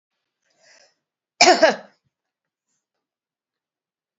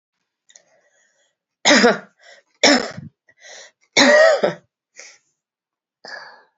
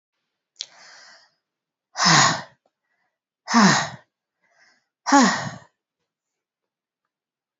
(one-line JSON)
{"cough_length": "4.2 s", "cough_amplitude": 32767, "cough_signal_mean_std_ratio": 0.21, "three_cough_length": "6.6 s", "three_cough_amplitude": 32767, "three_cough_signal_mean_std_ratio": 0.34, "exhalation_length": "7.6 s", "exhalation_amplitude": 28919, "exhalation_signal_mean_std_ratio": 0.3, "survey_phase": "beta (2021-08-13 to 2022-03-07)", "age": "65+", "gender": "Female", "wearing_mask": "No", "symptom_cough_any": true, "symptom_runny_or_blocked_nose": true, "symptom_headache": true, "smoker_status": "Never smoked", "respiratory_condition_asthma": false, "respiratory_condition_other": false, "recruitment_source": "Test and Trace", "submission_delay": "2 days", "covid_test_result": "Positive", "covid_test_method": "RT-qPCR", "covid_ct_value": 17.4, "covid_ct_gene": "ORF1ab gene", "covid_ct_mean": 17.8, "covid_viral_load": "1400000 copies/ml", "covid_viral_load_category": "High viral load (>1M copies/ml)"}